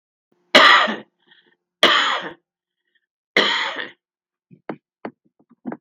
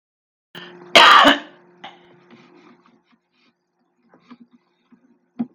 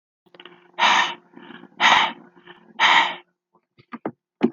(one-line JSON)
{"three_cough_length": "5.8 s", "three_cough_amplitude": 32767, "three_cough_signal_mean_std_ratio": 0.34, "cough_length": "5.5 s", "cough_amplitude": 32766, "cough_signal_mean_std_ratio": 0.25, "exhalation_length": "4.5 s", "exhalation_amplitude": 26908, "exhalation_signal_mean_std_ratio": 0.41, "survey_phase": "beta (2021-08-13 to 2022-03-07)", "age": "65+", "gender": "Female", "wearing_mask": "No", "symptom_none": true, "smoker_status": "Current smoker (1 to 10 cigarettes per day)", "respiratory_condition_asthma": false, "respiratory_condition_other": false, "recruitment_source": "REACT", "submission_delay": "3 days", "covid_test_result": "Negative", "covid_test_method": "RT-qPCR", "influenza_a_test_result": "Negative", "influenza_b_test_result": "Negative"}